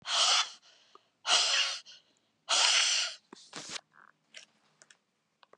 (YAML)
exhalation_length: 5.6 s
exhalation_amplitude: 9240
exhalation_signal_mean_std_ratio: 0.46
survey_phase: beta (2021-08-13 to 2022-03-07)
age: 65+
gender: Female
wearing_mask: 'No'
symptom_none: true
smoker_status: Ex-smoker
respiratory_condition_asthma: false
respiratory_condition_other: false
recruitment_source: REACT
submission_delay: 2 days
covid_test_result: Negative
covid_test_method: RT-qPCR
influenza_a_test_result: Negative
influenza_b_test_result: Negative